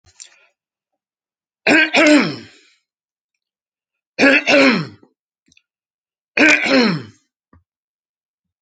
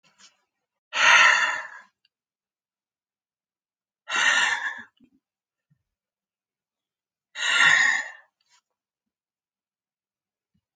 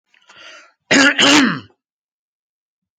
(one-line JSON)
{"three_cough_length": "8.6 s", "three_cough_amplitude": 30816, "three_cough_signal_mean_std_ratio": 0.38, "exhalation_length": "10.8 s", "exhalation_amplitude": 21622, "exhalation_signal_mean_std_ratio": 0.33, "cough_length": "3.0 s", "cough_amplitude": 29925, "cough_signal_mean_std_ratio": 0.39, "survey_phase": "alpha (2021-03-01 to 2021-08-12)", "age": "45-64", "gender": "Male", "wearing_mask": "No", "symptom_fatigue": true, "smoker_status": "Never smoked", "respiratory_condition_asthma": false, "respiratory_condition_other": false, "recruitment_source": "REACT", "submission_delay": "2 days", "covid_test_result": "Negative", "covid_test_method": "RT-qPCR"}